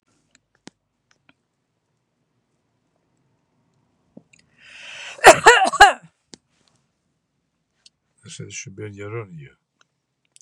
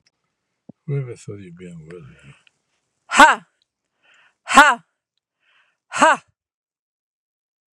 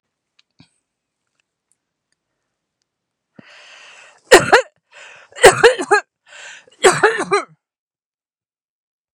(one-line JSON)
{"cough_length": "10.4 s", "cough_amplitude": 32768, "cough_signal_mean_std_ratio": 0.19, "exhalation_length": "7.8 s", "exhalation_amplitude": 32768, "exhalation_signal_mean_std_ratio": 0.24, "three_cough_length": "9.1 s", "three_cough_amplitude": 32768, "three_cough_signal_mean_std_ratio": 0.26, "survey_phase": "beta (2021-08-13 to 2022-03-07)", "age": "45-64", "gender": "Female", "wearing_mask": "No", "symptom_none": true, "smoker_status": "Ex-smoker", "respiratory_condition_asthma": false, "respiratory_condition_other": false, "recruitment_source": "REACT", "submission_delay": "6 days", "covid_test_result": "Negative", "covid_test_method": "RT-qPCR", "influenza_a_test_result": "Negative", "influenza_b_test_result": "Negative"}